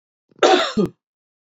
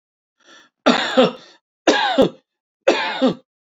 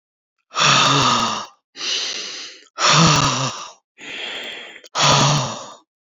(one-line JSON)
{"cough_length": "1.5 s", "cough_amplitude": 30101, "cough_signal_mean_std_ratio": 0.4, "three_cough_length": "3.8 s", "three_cough_amplitude": 28657, "three_cough_signal_mean_std_ratio": 0.45, "exhalation_length": "6.1 s", "exhalation_amplitude": 27972, "exhalation_signal_mean_std_ratio": 0.61, "survey_phase": "beta (2021-08-13 to 2022-03-07)", "age": "45-64", "gender": "Male", "wearing_mask": "No", "symptom_none": true, "smoker_status": "Ex-smoker", "respiratory_condition_asthma": false, "respiratory_condition_other": false, "recruitment_source": "REACT", "submission_delay": "4 days", "covid_test_result": "Negative", "covid_test_method": "RT-qPCR"}